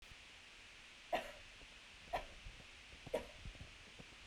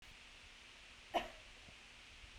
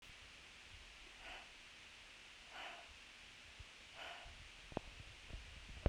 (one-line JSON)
{"three_cough_length": "4.3 s", "three_cough_amplitude": 4561, "three_cough_signal_mean_std_ratio": 0.46, "cough_length": "2.4 s", "cough_amplitude": 5609, "cough_signal_mean_std_ratio": 0.34, "exhalation_length": "5.9 s", "exhalation_amplitude": 3706, "exhalation_signal_mean_std_ratio": 0.55, "survey_phase": "beta (2021-08-13 to 2022-03-07)", "age": "18-44", "gender": "Female", "wearing_mask": "No", "symptom_none": true, "smoker_status": "Never smoked", "respiratory_condition_asthma": false, "respiratory_condition_other": false, "recruitment_source": "REACT", "submission_delay": "0 days", "covid_test_result": "Negative", "covid_test_method": "RT-qPCR", "influenza_a_test_result": "Negative", "influenza_b_test_result": "Negative"}